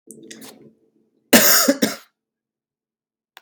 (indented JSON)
{
  "cough_length": "3.4 s",
  "cough_amplitude": 32768,
  "cough_signal_mean_std_ratio": 0.31,
  "survey_phase": "beta (2021-08-13 to 2022-03-07)",
  "age": "18-44",
  "gender": "Male",
  "wearing_mask": "No",
  "symptom_cough_any": true,
  "symptom_fatigue": true,
  "symptom_onset": "4 days",
  "smoker_status": "Ex-smoker",
  "respiratory_condition_asthma": false,
  "respiratory_condition_other": false,
  "recruitment_source": "REACT",
  "submission_delay": "0 days",
  "covid_test_result": "Negative",
  "covid_test_method": "RT-qPCR",
  "influenza_a_test_result": "Negative",
  "influenza_b_test_result": "Negative"
}